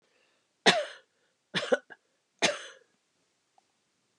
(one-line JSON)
{"three_cough_length": "4.2 s", "three_cough_amplitude": 15160, "three_cough_signal_mean_std_ratio": 0.25, "survey_phase": "alpha (2021-03-01 to 2021-08-12)", "age": "65+", "gender": "Female", "wearing_mask": "No", "symptom_none": true, "smoker_status": "Never smoked", "respiratory_condition_asthma": false, "respiratory_condition_other": false, "recruitment_source": "REACT", "submission_delay": "3 days", "covid_test_result": "Negative", "covid_test_method": "RT-qPCR"}